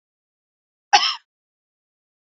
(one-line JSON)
{"cough_length": "2.4 s", "cough_amplitude": 32767, "cough_signal_mean_std_ratio": 0.2, "survey_phase": "alpha (2021-03-01 to 2021-08-12)", "age": "18-44", "gender": "Female", "wearing_mask": "No", "symptom_none": true, "smoker_status": "Never smoked", "respiratory_condition_asthma": false, "respiratory_condition_other": false, "recruitment_source": "REACT", "submission_delay": "1 day", "covid_test_result": "Negative", "covid_test_method": "RT-qPCR"}